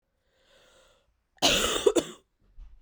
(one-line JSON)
{"cough_length": "2.8 s", "cough_amplitude": 13985, "cough_signal_mean_std_ratio": 0.35, "survey_phase": "beta (2021-08-13 to 2022-03-07)", "age": "18-44", "gender": "Female", "wearing_mask": "No", "symptom_cough_any": true, "symptom_runny_or_blocked_nose": true, "symptom_sore_throat": true, "symptom_fatigue": true, "symptom_headache": true, "symptom_change_to_sense_of_smell_or_taste": true, "symptom_loss_of_taste": true, "symptom_onset": "3 days", "smoker_status": "Never smoked", "respiratory_condition_asthma": false, "respiratory_condition_other": false, "recruitment_source": "Test and Trace", "submission_delay": "2 days", "covid_test_result": "Positive", "covid_test_method": "RT-qPCR", "covid_ct_value": 18.8, "covid_ct_gene": "ORF1ab gene"}